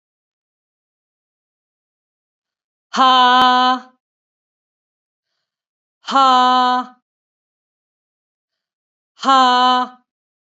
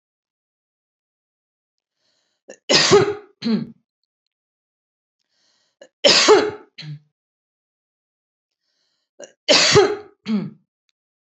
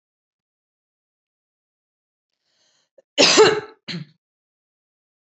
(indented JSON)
{
  "exhalation_length": "10.6 s",
  "exhalation_amplitude": 29284,
  "exhalation_signal_mean_std_ratio": 0.35,
  "three_cough_length": "11.3 s",
  "three_cough_amplitude": 32306,
  "three_cough_signal_mean_std_ratio": 0.31,
  "cough_length": "5.2 s",
  "cough_amplitude": 28424,
  "cough_signal_mean_std_ratio": 0.23,
  "survey_phase": "beta (2021-08-13 to 2022-03-07)",
  "age": "45-64",
  "gender": "Female",
  "wearing_mask": "No",
  "symptom_none": true,
  "smoker_status": "Never smoked",
  "respiratory_condition_asthma": false,
  "respiratory_condition_other": false,
  "recruitment_source": "REACT",
  "submission_delay": "3 days",
  "covid_test_result": "Negative",
  "covid_test_method": "RT-qPCR",
  "influenza_a_test_result": "Negative",
  "influenza_b_test_result": "Negative"
}